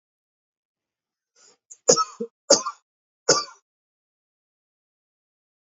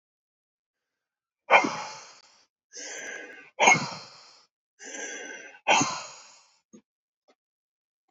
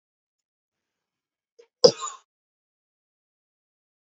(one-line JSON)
{"three_cough_length": "5.7 s", "three_cough_amplitude": 28875, "three_cough_signal_mean_std_ratio": 0.21, "exhalation_length": "8.1 s", "exhalation_amplitude": 21969, "exhalation_signal_mean_std_ratio": 0.29, "cough_length": "4.2 s", "cough_amplitude": 29430, "cough_signal_mean_std_ratio": 0.11, "survey_phase": "beta (2021-08-13 to 2022-03-07)", "age": "18-44", "gender": "Male", "wearing_mask": "No", "symptom_none": true, "smoker_status": "Never smoked", "respiratory_condition_asthma": false, "respiratory_condition_other": false, "recruitment_source": "REACT", "submission_delay": "1 day", "covid_test_result": "Negative", "covid_test_method": "RT-qPCR"}